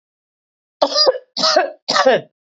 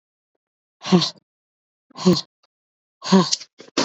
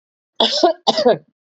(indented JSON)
{
  "three_cough_length": "2.5 s",
  "three_cough_amplitude": 27941,
  "three_cough_signal_mean_std_ratio": 0.51,
  "exhalation_length": "3.8 s",
  "exhalation_amplitude": 24113,
  "exhalation_signal_mean_std_ratio": 0.33,
  "cough_length": "1.5 s",
  "cough_amplitude": 29338,
  "cough_signal_mean_std_ratio": 0.5,
  "survey_phase": "beta (2021-08-13 to 2022-03-07)",
  "age": "18-44",
  "gender": "Female",
  "wearing_mask": "No",
  "symptom_none": true,
  "smoker_status": "Ex-smoker",
  "respiratory_condition_asthma": false,
  "respiratory_condition_other": false,
  "recruitment_source": "REACT",
  "submission_delay": "3 days",
  "covid_test_result": "Negative",
  "covid_test_method": "RT-qPCR",
  "influenza_a_test_result": "Negative",
  "influenza_b_test_result": "Negative"
}